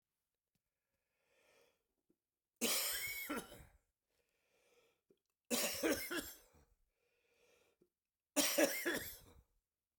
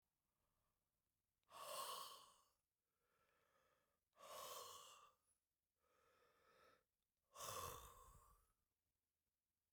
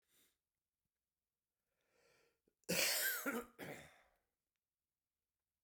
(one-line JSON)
{"three_cough_length": "10.0 s", "three_cough_amplitude": 3776, "three_cough_signal_mean_std_ratio": 0.37, "exhalation_length": "9.7 s", "exhalation_amplitude": 339, "exhalation_signal_mean_std_ratio": 0.41, "cough_length": "5.6 s", "cough_amplitude": 2075, "cough_signal_mean_std_ratio": 0.31, "survey_phase": "beta (2021-08-13 to 2022-03-07)", "age": "45-64", "gender": "Male", "wearing_mask": "No", "symptom_cough_any": true, "symptom_runny_or_blocked_nose": true, "symptom_fatigue": true, "symptom_headache": true, "smoker_status": "Ex-smoker", "respiratory_condition_asthma": false, "respiratory_condition_other": false, "recruitment_source": "Test and Trace", "submission_delay": "3 days", "covid_test_result": "Positive", "covid_test_method": "RT-qPCR", "covid_ct_value": 22.8, "covid_ct_gene": "ORF1ab gene", "covid_ct_mean": 24.1, "covid_viral_load": "13000 copies/ml", "covid_viral_load_category": "Low viral load (10K-1M copies/ml)"}